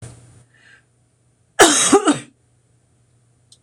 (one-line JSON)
{"cough_length": "3.6 s", "cough_amplitude": 26028, "cough_signal_mean_std_ratio": 0.31, "survey_phase": "beta (2021-08-13 to 2022-03-07)", "age": "65+", "gender": "Female", "wearing_mask": "No", "symptom_runny_or_blocked_nose": true, "symptom_sore_throat": true, "symptom_fatigue": true, "smoker_status": "Never smoked", "respiratory_condition_asthma": false, "respiratory_condition_other": false, "recruitment_source": "REACT", "submission_delay": "2 days", "covid_test_result": "Negative", "covid_test_method": "RT-qPCR"}